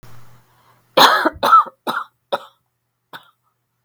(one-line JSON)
{"cough_length": "3.8 s", "cough_amplitude": 32768, "cough_signal_mean_std_ratio": 0.34, "survey_phase": "beta (2021-08-13 to 2022-03-07)", "age": "45-64", "gender": "Female", "wearing_mask": "No", "symptom_fatigue": true, "symptom_headache": true, "symptom_onset": "12 days", "smoker_status": "Never smoked", "respiratory_condition_asthma": false, "respiratory_condition_other": false, "recruitment_source": "REACT", "submission_delay": "3 days", "covid_test_result": "Negative", "covid_test_method": "RT-qPCR"}